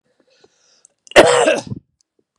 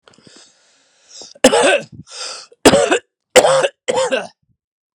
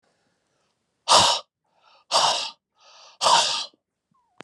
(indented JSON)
{
  "cough_length": "2.4 s",
  "cough_amplitude": 32768,
  "cough_signal_mean_std_ratio": 0.34,
  "three_cough_length": "4.9 s",
  "three_cough_amplitude": 32768,
  "three_cough_signal_mean_std_ratio": 0.42,
  "exhalation_length": "4.4 s",
  "exhalation_amplitude": 26062,
  "exhalation_signal_mean_std_ratio": 0.39,
  "survey_phase": "beta (2021-08-13 to 2022-03-07)",
  "age": "45-64",
  "gender": "Male",
  "wearing_mask": "No",
  "symptom_cough_any": true,
  "symptom_runny_or_blocked_nose": true,
  "symptom_sore_throat": true,
  "symptom_fatigue": true,
  "symptom_headache": true,
  "symptom_other": true,
  "symptom_onset": "4 days",
  "smoker_status": "Ex-smoker",
  "respiratory_condition_asthma": false,
  "respiratory_condition_other": false,
  "recruitment_source": "Test and Trace",
  "submission_delay": "2 days",
  "covid_test_result": "Positive",
  "covid_test_method": "RT-qPCR",
  "covid_ct_value": 22.4,
  "covid_ct_gene": "ORF1ab gene"
}